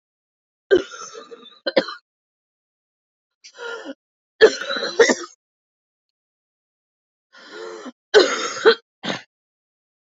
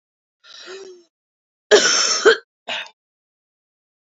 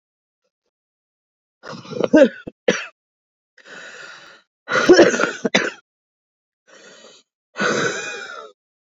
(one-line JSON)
{"three_cough_length": "10.1 s", "three_cough_amplitude": 29630, "three_cough_signal_mean_std_ratio": 0.28, "cough_length": "4.0 s", "cough_amplitude": 28234, "cough_signal_mean_std_ratio": 0.33, "exhalation_length": "8.9 s", "exhalation_amplitude": 32163, "exhalation_signal_mean_std_ratio": 0.33, "survey_phase": "beta (2021-08-13 to 2022-03-07)", "age": "18-44", "gender": "Female", "wearing_mask": "Yes", "symptom_cough_any": true, "symptom_shortness_of_breath": true, "symptom_sore_throat": true, "symptom_fatigue": true, "symptom_fever_high_temperature": true, "symptom_headache": true, "symptom_other": true, "symptom_onset": "3 days", "smoker_status": "Current smoker (11 or more cigarettes per day)", "respiratory_condition_asthma": false, "respiratory_condition_other": false, "recruitment_source": "Test and Trace", "submission_delay": "1 day", "covid_test_result": "Positive", "covid_test_method": "RT-qPCR", "covid_ct_value": 23.6, "covid_ct_gene": "N gene"}